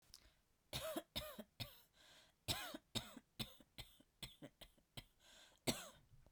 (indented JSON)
{
  "cough_length": "6.3 s",
  "cough_amplitude": 2500,
  "cough_signal_mean_std_ratio": 0.4,
  "survey_phase": "beta (2021-08-13 to 2022-03-07)",
  "age": "45-64",
  "gender": "Female",
  "wearing_mask": "No",
  "symptom_none": true,
  "smoker_status": "Ex-smoker",
  "respiratory_condition_asthma": false,
  "respiratory_condition_other": false,
  "recruitment_source": "REACT",
  "submission_delay": "1 day",
  "covid_test_result": "Negative",
  "covid_test_method": "RT-qPCR"
}